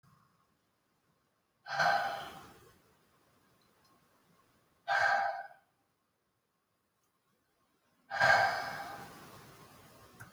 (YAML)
exhalation_length: 10.3 s
exhalation_amplitude: 7592
exhalation_signal_mean_std_ratio: 0.34
survey_phase: beta (2021-08-13 to 2022-03-07)
age: 45-64
gender: Male
wearing_mask: 'No'
symptom_none: true
smoker_status: Never smoked
respiratory_condition_asthma: false
respiratory_condition_other: false
recruitment_source: REACT
submission_delay: 1 day
covid_test_result: Negative
covid_test_method: RT-qPCR